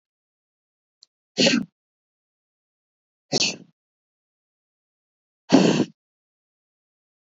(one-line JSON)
{"exhalation_length": "7.3 s", "exhalation_amplitude": 26219, "exhalation_signal_mean_std_ratio": 0.24, "survey_phase": "beta (2021-08-13 to 2022-03-07)", "age": "45-64", "gender": "Female", "wearing_mask": "No", "symptom_none": true, "smoker_status": "Never smoked", "respiratory_condition_asthma": false, "respiratory_condition_other": false, "recruitment_source": "Test and Trace", "submission_delay": "1 day", "covid_test_result": "Negative", "covid_test_method": "RT-qPCR"}